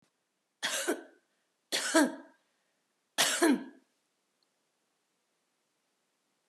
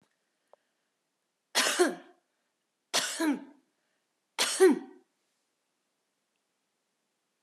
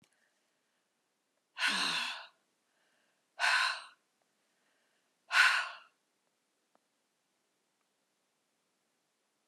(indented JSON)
{
  "cough_length": "6.5 s",
  "cough_amplitude": 8961,
  "cough_signal_mean_std_ratio": 0.31,
  "three_cough_length": "7.4 s",
  "three_cough_amplitude": 11033,
  "three_cough_signal_mean_std_ratio": 0.29,
  "exhalation_length": "9.5 s",
  "exhalation_amplitude": 7719,
  "exhalation_signal_mean_std_ratio": 0.29,
  "survey_phase": "alpha (2021-03-01 to 2021-08-12)",
  "age": "65+",
  "gender": "Female",
  "wearing_mask": "No",
  "symptom_none": true,
  "smoker_status": "Never smoked",
  "respiratory_condition_asthma": true,
  "respiratory_condition_other": false,
  "recruitment_source": "REACT",
  "submission_delay": "8 days",
  "covid_test_result": "Negative",
  "covid_test_method": "RT-qPCR"
}